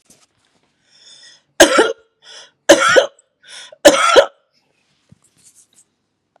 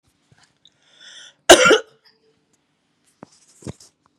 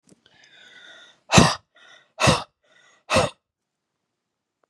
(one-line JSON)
{"three_cough_length": "6.4 s", "three_cough_amplitude": 32768, "three_cough_signal_mean_std_ratio": 0.32, "cough_length": "4.2 s", "cough_amplitude": 32768, "cough_signal_mean_std_ratio": 0.21, "exhalation_length": "4.7 s", "exhalation_amplitude": 32507, "exhalation_signal_mean_std_ratio": 0.28, "survey_phase": "beta (2021-08-13 to 2022-03-07)", "age": "18-44", "gender": "Female", "wearing_mask": "No", "symptom_none": true, "smoker_status": "Never smoked", "respiratory_condition_asthma": false, "respiratory_condition_other": false, "recruitment_source": "REACT", "submission_delay": "1 day", "covid_test_result": "Negative", "covid_test_method": "RT-qPCR", "influenza_a_test_result": "Unknown/Void", "influenza_b_test_result": "Unknown/Void"}